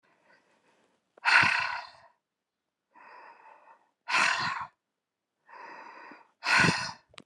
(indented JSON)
{
  "exhalation_length": "7.3 s",
  "exhalation_amplitude": 16091,
  "exhalation_signal_mean_std_ratio": 0.37,
  "survey_phase": "alpha (2021-03-01 to 2021-08-12)",
  "age": "65+",
  "gender": "Female",
  "wearing_mask": "No",
  "symptom_none": true,
  "smoker_status": "Ex-smoker",
  "respiratory_condition_asthma": false,
  "respiratory_condition_other": false,
  "recruitment_source": "REACT",
  "submission_delay": "1 day",
  "covid_test_result": "Negative",
  "covid_test_method": "RT-qPCR"
}